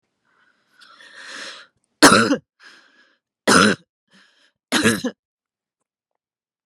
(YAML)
three_cough_length: 6.7 s
three_cough_amplitude: 32768
three_cough_signal_mean_std_ratio: 0.29
survey_phase: beta (2021-08-13 to 2022-03-07)
age: 18-44
gender: Female
wearing_mask: 'No'
symptom_sore_throat: true
symptom_onset: 2 days
smoker_status: Ex-smoker
respiratory_condition_asthma: true
respiratory_condition_other: false
recruitment_source: REACT
submission_delay: 2 days
covid_test_result: Negative
covid_test_method: RT-qPCR